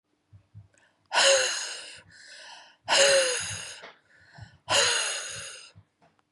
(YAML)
exhalation_length: 6.3 s
exhalation_amplitude: 15571
exhalation_signal_mean_std_ratio: 0.46
survey_phase: beta (2021-08-13 to 2022-03-07)
age: 45-64
gender: Female
wearing_mask: 'No'
symptom_none: true
smoker_status: Never smoked
respiratory_condition_asthma: false
respiratory_condition_other: false
recruitment_source: REACT
submission_delay: 1 day
covid_test_result: Negative
covid_test_method: RT-qPCR
influenza_a_test_result: Negative
influenza_b_test_result: Negative